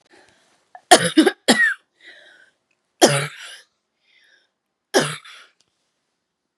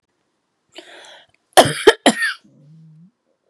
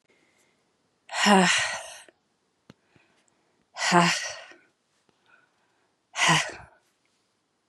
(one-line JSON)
{"three_cough_length": "6.6 s", "three_cough_amplitude": 32768, "three_cough_signal_mean_std_ratio": 0.29, "cough_length": "3.5 s", "cough_amplitude": 32768, "cough_signal_mean_std_ratio": 0.26, "exhalation_length": "7.7 s", "exhalation_amplitude": 25217, "exhalation_signal_mean_std_ratio": 0.34, "survey_phase": "beta (2021-08-13 to 2022-03-07)", "age": "18-44", "gender": "Female", "wearing_mask": "No", "symptom_cough_any": true, "symptom_runny_or_blocked_nose": true, "symptom_fatigue": true, "symptom_headache": true, "smoker_status": "Never smoked", "respiratory_condition_asthma": false, "respiratory_condition_other": false, "recruitment_source": "Test and Trace", "submission_delay": "2 days", "covid_test_result": "Positive", "covid_test_method": "RT-qPCR", "covid_ct_value": 20.4, "covid_ct_gene": "N gene"}